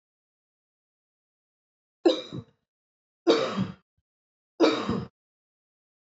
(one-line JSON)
{"three_cough_length": "6.1 s", "three_cough_amplitude": 14858, "three_cough_signal_mean_std_ratio": 0.3, "survey_phase": "beta (2021-08-13 to 2022-03-07)", "age": "18-44", "gender": "Female", "wearing_mask": "No", "symptom_none": true, "smoker_status": "Ex-smoker", "respiratory_condition_asthma": false, "respiratory_condition_other": false, "recruitment_source": "Test and Trace", "submission_delay": "1 day", "covid_test_result": "Negative", "covid_test_method": "RT-qPCR"}